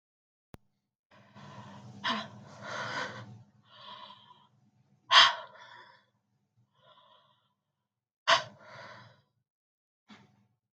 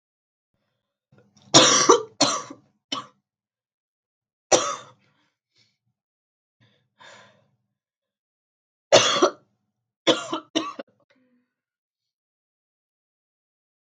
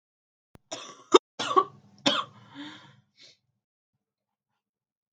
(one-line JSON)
{"exhalation_length": "10.8 s", "exhalation_amplitude": 22208, "exhalation_signal_mean_std_ratio": 0.23, "three_cough_length": "14.0 s", "three_cough_amplitude": 32768, "three_cough_signal_mean_std_ratio": 0.24, "cough_length": "5.1 s", "cough_amplitude": 25166, "cough_signal_mean_std_ratio": 0.21, "survey_phase": "beta (2021-08-13 to 2022-03-07)", "age": "18-44", "gender": "Female", "wearing_mask": "No", "symptom_cough_any": true, "symptom_new_continuous_cough": true, "symptom_runny_or_blocked_nose": true, "symptom_sore_throat": true, "symptom_diarrhoea": true, "symptom_fatigue": true, "symptom_fever_high_temperature": true, "symptom_change_to_sense_of_smell_or_taste": true, "symptom_other": true, "smoker_status": "Never smoked", "respiratory_condition_asthma": false, "respiratory_condition_other": false, "recruitment_source": "Test and Trace", "submission_delay": "1 day", "covid_test_result": "Positive", "covid_test_method": "RT-qPCR", "covid_ct_value": 32.6, "covid_ct_gene": "ORF1ab gene", "covid_ct_mean": 32.6, "covid_viral_load": "21 copies/ml", "covid_viral_load_category": "Minimal viral load (< 10K copies/ml)"}